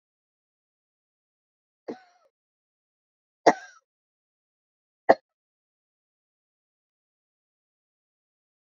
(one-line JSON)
{"three_cough_length": "8.6 s", "three_cough_amplitude": 24884, "three_cough_signal_mean_std_ratio": 0.09, "survey_phase": "beta (2021-08-13 to 2022-03-07)", "age": "45-64", "gender": "Female", "wearing_mask": "No", "symptom_none": true, "smoker_status": "Never smoked", "respiratory_condition_asthma": false, "respiratory_condition_other": false, "recruitment_source": "REACT", "submission_delay": "2 days", "covid_test_result": "Negative", "covid_test_method": "RT-qPCR"}